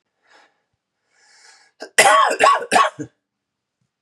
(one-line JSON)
{"cough_length": "4.0 s", "cough_amplitude": 32767, "cough_signal_mean_std_ratio": 0.37, "survey_phase": "beta (2021-08-13 to 2022-03-07)", "age": "18-44", "gender": "Male", "wearing_mask": "No", "symptom_cough_any": true, "symptom_runny_or_blocked_nose": true, "symptom_shortness_of_breath": true, "symptom_fatigue": true, "symptom_onset": "4 days", "smoker_status": "Never smoked", "respiratory_condition_asthma": false, "respiratory_condition_other": false, "recruitment_source": "Test and Trace", "submission_delay": "1 day", "covid_test_result": "Positive", "covid_test_method": "RT-qPCR"}